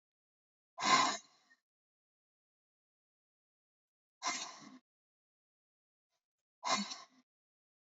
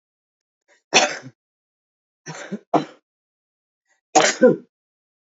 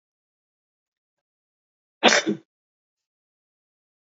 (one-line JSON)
{"exhalation_length": "7.9 s", "exhalation_amplitude": 5241, "exhalation_signal_mean_std_ratio": 0.24, "three_cough_length": "5.4 s", "three_cough_amplitude": 30637, "three_cough_signal_mean_std_ratio": 0.27, "cough_length": "4.1 s", "cough_amplitude": 28887, "cough_signal_mean_std_ratio": 0.18, "survey_phase": "beta (2021-08-13 to 2022-03-07)", "age": "65+", "gender": "Female", "wearing_mask": "Yes", "symptom_cough_any": true, "smoker_status": "Current smoker (1 to 10 cigarettes per day)", "respiratory_condition_asthma": false, "respiratory_condition_other": true, "recruitment_source": "Test and Trace", "submission_delay": "1 day", "covid_test_result": "Positive", "covid_test_method": "RT-qPCR", "covid_ct_value": 18.9, "covid_ct_gene": "ORF1ab gene", "covid_ct_mean": 19.7, "covid_viral_load": "340000 copies/ml", "covid_viral_load_category": "Low viral load (10K-1M copies/ml)"}